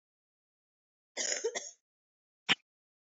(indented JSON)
{
  "cough_length": "3.1 s",
  "cough_amplitude": 8296,
  "cough_signal_mean_std_ratio": 0.27,
  "survey_phase": "beta (2021-08-13 to 2022-03-07)",
  "age": "18-44",
  "gender": "Female",
  "wearing_mask": "No",
  "symptom_new_continuous_cough": true,
  "symptom_runny_or_blocked_nose": true,
  "symptom_fatigue": true,
  "symptom_fever_high_temperature": true,
  "symptom_headache": true,
  "symptom_change_to_sense_of_smell_or_taste": true,
  "symptom_other": true,
  "symptom_onset": "3 days",
  "smoker_status": "Never smoked",
  "respiratory_condition_asthma": false,
  "respiratory_condition_other": false,
  "recruitment_source": "Test and Trace",
  "submission_delay": "2 days",
  "covid_test_result": "Positive",
  "covid_test_method": "RT-qPCR"
}